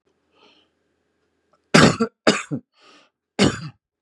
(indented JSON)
{
  "cough_length": "4.0 s",
  "cough_amplitude": 32768,
  "cough_signal_mean_std_ratio": 0.29,
  "survey_phase": "beta (2021-08-13 to 2022-03-07)",
  "age": "45-64",
  "gender": "Male",
  "wearing_mask": "No",
  "symptom_none": true,
  "smoker_status": "Current smoker (11 or more cigarettes per day)",
  "respiratory_condition_asthma": false,
  "respiratory_condition_other": false,
  "recruitment_source": "REACT",
  "submission_delay": "2 days",
  "covid_test_result": "Negative",
  "covid_test_method": "RT-qPCR",
  "influenza_a_test_result": "Negative",
  "influenza_b_test_result": "Negative"
}